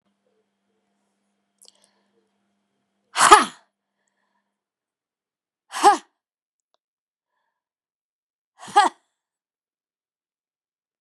{"exhalation_length": "11.0 s", "exhalation_amplitude": 32768, "exhalation_signal_mean_std_ratio": 0.17, "survey_phase": "beta (2021-08-13 to 2022-03-07)", "age": "65+", "gender": "Female", "wearing_mask": "No", "symptom_none": true, "smoker_status": "Ex-smoker", "respiratory_condition_asthma": false, "respiratory_condition_other": false, "recruitment_source": "REACT", "submission_delay": "5 days", "covid_test_result": "Negative", "covid_test_method": "RT-qPCR", "influenza_a_test_result": "Negative", "influenza_b_test_result": "Negative"}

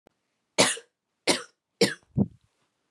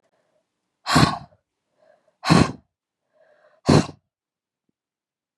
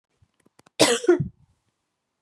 {"three_cough_length": "2.9 s", "three_cough_amplitude": 23342, "three_cough_signal_mean_std_ratio": 0.31, "exhalation_length": "5.4 s", "exhalation_amplitude": 28422, "exhalation_signal_mean_std_ratio": 0.27, "cough_length": "2.2 s", "cough_amplitude": 26065, "cough_signal_mean_std_ratio": 0.31, "survey_phase": "beta (2021-08-13 to 2022-03-07)", "age": "18-44", "gender": "Female", "wearing_mask": "No", "symptom_cough_any": true, "symptom_runny_or_blocked_nose": true, "symptom_fatigue": true, "symptom_headache": true, "symptom_onset": "3 days", "smoker_status": "Never smoked", "respiratory_condition_asthma": false, "respiratory_condition_other": false, "recruitment_source": "Test and Trace", "submission_delay": "2 days", "covid_test_result": "Positive", "covid_test_method": "RT-qPCR", "covid_ct_value": 33.2, "covid_ct_gene": "N gene"}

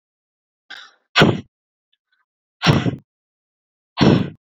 {"exhalation_length": "4.5 s", "exhalation_amplitude": 29461, "exhalation_signal_mean_std_ratio": 0.32, "survey_phase": "beta (2021-08-13 to 2022-03-07)", "age": "18-44", "gender": "Female", "wearing_mask": "No", "symptom_none": true, "smoker_status": "Never smoked", "respiratory_condition_asthma": false, "respiratory_condition_other": false, "recruitment_source": "REACT", "submission_delay": "1 day", "covid_test_result": "Negative", "covid_test_method": "RT-qPCR"}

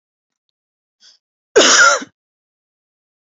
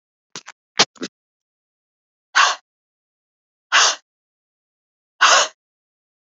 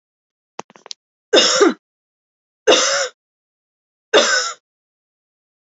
{"cough_length": "3.2 s", "cough_amplitude": 31576, "cough_signal_mean_std_ratio": 0.31, "exhalation_length": "6.4 s", "exhalation_amplitude": 32658, "exhalation_signal_mean_std_ratio": 0.27, "three_cough_length": "5.7 s", "three_cough_amplitude": 29982, "three_cough_signal_mean_std_ratio": 0.35, "survey_phase": "alpha (2021-03-01 to 2021-08-12)", "age": "45-64", "gender": "Female", "wearing_mask": "No", "symptom_none": true, "smoker_status": "Ex-smoker", "respiratory_condition_asthma": false, "respiratory_condition_other": false, "recruitment_source": "REACT", "submission_delay": "3 days", "covid_test_result": "Negative", "covid_test_method": "RT-qPCR"}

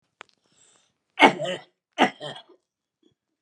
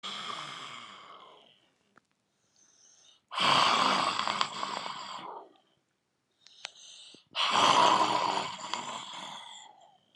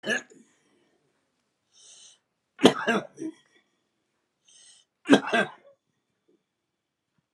{"cough_length": "3.4 s", "cough_amplitude": 30378, "cough_signal_mean_std_ratio": 0.24, "exhalation_length": "10.2 s", "exhalation_amplitude": 16279, "exhalation_signal_mean_std_ratio": 0.48, "three_cough_length": "7.3 s", "three_cough_amplitude": 30093, "three_cough_signal_mean_std_ratio": 0.23, "survey_phase": "alpha (2021-03-01 to 2021-08-12)", "age": "65+", "gender": "Male", "wearing_mask": "No", "symptom_cough_any": true, "symptom_fatigue": true, "symptom_onset": "3 days", "smoker_status": "Ex-smoker", "respiratory_condition_asthma": false, "respiratory_condition_other": false, "recruitment_source": "Test and Trace", "submission_delay": "2 days", "covid_test_result": "Positive", "covid_test_method": "RT-qPCR"}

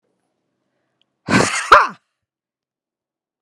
{"exhalation_length": "3.4 s", "exhalation_amplitude": 32768, "exhalation_signal_mean_std_ratio": 0.27, "survey_phase": "beta (2021-08-13 to 2022-03-07)", "age": "45-64", "gender": "Female", "wearing_mask": "No", "symptom_none": true, "smoker_status": "Ex-smoker", "respiratory_condition_asthma": false, "respiratory_condition_other": false, "recruitment_source": "REACT", "submission_delay": "0 days", "covid_test_result": "Negative", "covid_test_method": "RT-qPCR", "influenza_a_test_result": "Negative", "influenza_b_test_result": "Negative"}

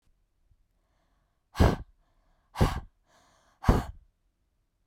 {"exhalation_length": "4.9 s", "exhalation_amplitude": 16750, "exhalation_signal_mean_std_ratio": 0.25, "survey_phase": "beta (2021-08-13 to 2022-03-07)", "age": "18-44", "gender": "Female", "wearing_mask": "No", "symptom_cough_any": true, "symptom_sore_throat": true, "symptom_headache": true, "smoker_status": "Never smoked", "respiratory_condition_asthma": false, "respiratory_condition_other": false, "recruitment_source": "Test and Trace", "submission_delay": "2 days", "covid_test_result": "Positive", "covid_test_method": "RT-qPCR", "covid_ct_value": 28.2, "covid_ct_gene": "N gene", "covid_ct_mean": 28.2, "covid_viral_load": "560 copies/ml", "covid_viral_load_category": "Minimal viral load (< 10K copies/ml)"}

